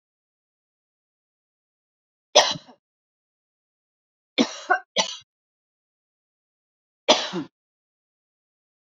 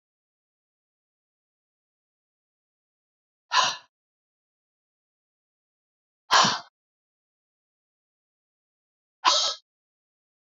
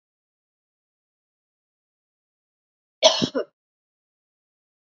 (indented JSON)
{
  "three_cough_length": "9.0 s",
  "three_cough_amplitude": 32767,
  "three_cough_signal_mean_std_ratio": 0.2,
  "exhalation_length": "10.5 s",
  "exhalation_amplitude": 17064,
  "exhalation_signal_mean_std_ratio": 0.2,
  "cough_length": "4.9 s",
  "cough_amplitude": 28625,
  "cough_signal_mean_std_ratio": 0.17,
  "survey_phase": "beta (2021-08-13 to 2022-03-07)",
  "age": "45-64",
  "gender": "Female",
  "wearing_mask": "No",
  "symptom_none": true,
  "smoker_status": "Never smoked",
  "respiratory_condition_asthma": false,
  "respiratory_condition_other": false,
  "recruitment_source": "REACT",
  "submission_delay": "2 days",
  "covid_test_result": "Negative",
  "covid_test_method": "RT-qPCR",
  "influenza_a_test_result": "Negative",
  "influenza_b_test_result": "Negative"
}